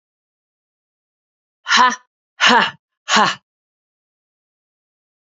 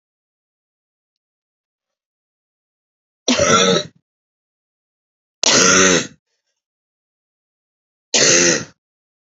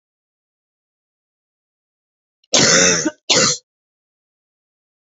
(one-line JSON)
{"exhalation_length": "5.2 s", "exhalation_amplitude": 30269, "exhalation_signal_mean_std_ratio": 0.3, "three_cough_length": "9.2 s", "three_cough_amplitude": 32768, "three_cough_signal_mean_std_ratio": 0.34, "cough_length": "5.0 s", "cough_amplitude": 32082, "cough_signal_mean_std_ratio": 0.32, "survey_phase": "alpha (2021-03-01 to 2021-08-12)", "age": "45-64", "gender": "Female", "wearing_mask": "No", "symptom_fatigue": true, "symptom_headache": true, "smoker_status": "Never smoked", "respiratory_condition_asthma": false, "respiratory_condition_other": false, "recruitment_source": "Test and Trace", "submission_delay": "2 days", "covid_test_result": "Positive", "covid_test_method": "RT-qPCR", "covid_ct_value": 12.3, "covid_ct_gene": "ORF1ab gene", "covid_ct_mean": 12.5, "covid_viral_load": "78000000 copies/ml", "covid_viral_load_category": "High viral load (>1M copies/ml)"}